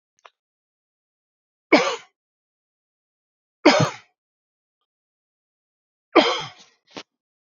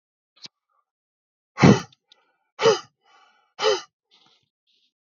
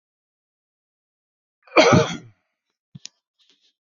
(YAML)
three_cough_length: 7.5 s
three_cough_amplitude: 27822
three_cough_signal_mean_std_ratio: 0.22
exhalation_length: 5.0 s
exhalation_amplitude: 27583
exhalation_signal_mean_std_ratio: 0.24
cough_length: 3.9 s
cough_amplitude: 27968
cough_signal_mean_std_ratio: 0.23
survey_phase: beta (2021-08-13 to 2022-03-07)
age: 18-44
gender: Male
wearing_mask: 'No'
symptom_cough_any: true
symptom_runny_or_blocked_nose: true
symptom_sore_throat: true
symptom_diarrhoea: true
symptom_fatigue: true
symptom_fever_high_temperature: true
symptom_headache: true
symptom_change_to_sense_of_smell_or_taste: true
smoker_status: Never smoked
respiratory_condition_asthma: false
respiratory_condition_other: false
recruitment_source: Test and Trace
submission_delay: 2 days
covid_test_result: Positive
covid_test_method: RT-qPCR
covid_ct_value: 26.1
covid_ct_gene: ORF1ab gene